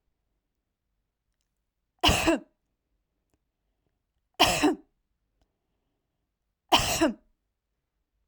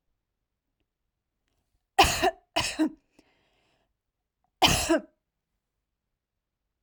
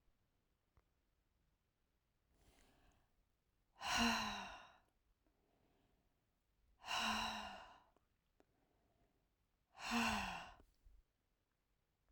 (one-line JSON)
{"three_cough_length": "8.3 s", "three_cough_amplitude": 17352, "three_cough_signal_mean_std_ratio": 0.28, "cough_length": "6.8 s", "cough_amplitude": 17470, "cough_signal_mean_std_ratio": 0.27, "exhalation_length": "12.1 s", "exhalation_amplitude": 1608, "exhalation_signal_mean_std_ratio": 0.34, "survey_phase": "alpha (2021-03-01 to 2021-08-12)", "age": "18-44", "gender": "Female", "wearing_mask": "No", "symptom_none": true, "smoker_status": "Never smoked", "respiratory_condition_asthma": false, "respiratory_condition_other": false, "recruitment_source": "REACT", "submission_delay": "3 days", "covid_test_result": "Negative", "covid_test_method": "RT-qPCR"}